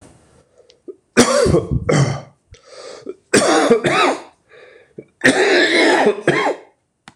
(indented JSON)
{
  "three_cough_length": "7.2 s",
  "three_cough_amplitude": 26028,
  "three_cough_signal_mean_std_ratio": 0.58,
  "survey_phase": "beta (2021-08-13 to 2022-03-07)",
  "age": "45-64",
  "gender": "Male",
  "wearing_mask": "No",
  "symptom_cough_any": true,
  "symptom_runny_or_blocked_nose": true,
  "symptom_shortness_of_breath": true,
  "symptom_sore_throat": true,
  "symptom_fatigue": true,
  "symptom_headache": true,
  "symptom_change_to_sense_of_smell_or_taste": true,
  "symptom_loss_of_taste": true,
  "symptom_onset": "7 days",
  "smoker_status": "Ex-smoker",
  "respiratory_condition_asthma": false,
  "respiratory_condition_other": false,
  "recruitment_source": "Test and Trace",
  "submission_delay": "1 day",
  "covid_test_result": "Positive",
  "covid_test_method": "RT-qPCR",
  "covid_ct_value": 23.3,
  "covid_ct_gene": "ORF1ab gene"
}